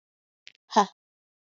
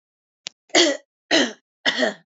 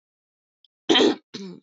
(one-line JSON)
{"exhalation_length": "1.5 s", "exhalation_amplitude": 17372, "exhalation_signal_mean_std_ratio": 0.19, "three_cough_length": "2.4 s", "three_cough_amplitude": 25960, "three_cough_signal_mean_std_ratio": 0.41, "cough_length": "1.6 s", "cough_amplitude": 18323, "cough_signal_mean_std_ratio": 0.35, "survey_phase": "beta (2021-08-13 to 2022-03-07)", "age": "18-44", "gender": "Female", "wearing_mask": "No", "symptom_none": true, "smoker_status": "Never smoked", "respiratory_condition_asthma": true, "respiratory_condition_other": false, "recruitment_source": "REACT", "submission_delay": "3 days", "covid_test_result": "Negative", "covid_test_method": "RT-qPCR", "influenza_a_test_result": "Unknown/Void", "influenza_b_test_result": "Unknown/Void"}